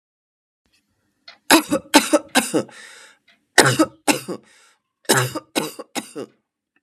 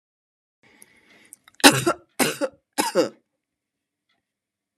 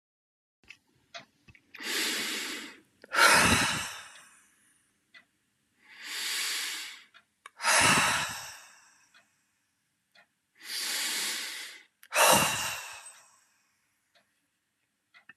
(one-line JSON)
{"cough_length": "6.8 s", "cough_amplitude": 32768, "cough_signal_mean_std_ratio": 0.34, "three_cough_length": "4.8 s", "three_cough_amplitude": 32767, "three_cough_signal_mean_std_ratio": 0.26, "exhalation_length": "15.4 s", "exhalation_amplitude": 13514, "exhalation_signal_mean_std_ratio": 0.41, "survey_phase": "beta (2021-08-13 to 2022-03-07)", "age": "45-64", "gender": "Female", "wearing_mask": "No", "symptom_none": true, "smoker_status": "Ex-smoker", "respiratory_condition_asthma": true, "respiratory_condition_other": false, "recruitment_source": "REACT", "submission_delay": "4 days", "covid_test_result": "Negative", "covid_test_method": "RT-qPCR", "influenza_a_test_result": "Negative", "influenza_b_test_result": "Negative"}